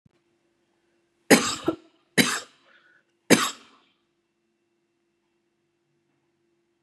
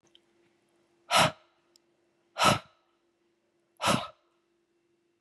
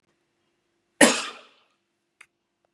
{
  "three_cough_length": "6.8 s",
  "three_cough_amplitude": 31073,
  "three_cough_signal_mean_std_ratio": 0.22,
  "exhalation_length": "5.2 s",
  "exhalation_amplitude": 13281,
  "exhalation_signal_mean_std_ratio": 0.27,
  "cough_length": "2.7 s",
  "cough_amplitude": 31468,
  "cough_signal_mean_std_ratio": 0.2,
  "survey_phase": "beta (2021-08-13 to 2022-03-07)",
  "age": "45-64",
  "gender": "Female",
  "wearing_mask": "No",
  "symptom_cough_any": true,
  "smoker_status": "Never smoked",
  "respiratory_condition_asthma": false,
  "respiratory_condition_other": false,
  "recruitment_source": "REACT",
  "submission_delay": "2 days",
  "covid_test_result": "Negative",
  "covid_test_method": "RT-qPCR"
}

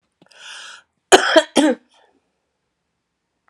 {
  "cough_length": "3.5 s",
  "cough_amplitude": 32768,
  "cough_signal_mean_std_ratio": 0.28,
  "survey_phase": "alpha (2021-03-01 to 2021-08-12)",
  "age": "45-64",
  "gender": "Female",
  "wearing_mask": "No",
  "symptom_none": true,
  "smoker_status": "Prefer not to say",
  "respiratory_condition_asthma": true,
  "respiratory_condition_other": false,
  "recruitment_source": "Test and Trace",
  "submission_delay": "2 days",
  "covid_test_result": "Positive",
  "covid_test_method": "RT-qPCR",
  "covid_ct_value": 12.7,
  "covid_ct_gene": "ORF1ab gene",
  "covid_ct_mean": 13.3,
  "covid_viral_load": "42000000 copies/ml",
  "covid_viral_load_category": "High viral load (>1M copies/ml)"
}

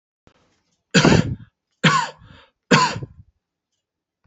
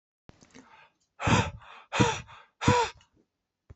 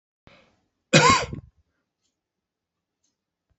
{
  "three_cough_length": "4.3 s",
  "three_cough_amplitude": 29349,
  "three_cough_signal_mean_std_ratio": 0.35,
  "exhalation_length": "3.8 s",
  "exhalation_amplitude": 13617,
  "exhalation_signal_mean_std_ratio": 0.37,
  "cough_length": "3.6 s",
  "cough_amplitude": 29087,
  "cough_signal_mean_std_ratio": 0.24,
  "survey_phase": "beta (2021-08-13 to 2022-03-07)",
  "age": "65+",
  "gender": "Male",
  "wearing_mask": "No",
  "symptom_none": true,
  "smoker_status": "Ex-smoker",
  "respiratory_condition_asthma": false,
  "respiratory_condition_other": false,
  "recruitment_source": "REACT",
  "submission_delay": "2 days",
  "covid_test_result": "Negative",
  "covid_test_method": "RT-qPCR"
}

